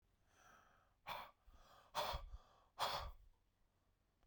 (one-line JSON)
{"exhalation_length": "4.3 s", "exhalation_amplitude": 1312, "exhalation_signal_mean_std_ratio": 0.42, "survey_phase": "beta (2021-08-13 to 2022-03-07)", "age": "45-64", "gender": "Male", "wearing_mask": "No", "symptom_cough_any": true, "symptom_runny_or_blocked_nose": true, "symptom_shortness_of_breath": true, "symptom_sore_throat": true, "symptom_diarrhoea": true, "symptom_fatigue": true, "symptom_fever_high_temperature": true, "symptom_headache": true, "symptom_other": true, "symptom_onset": "3 days", "smoker_status": "Ex-smoker", "respiratory_condition_asthma": false, "respiratory_condition_other": false, "recruitment_source": "Test and Trace", "submission_delay": "2 days", "covid_test_result": "Positive", "covid_test_method": "RT-qPCR"}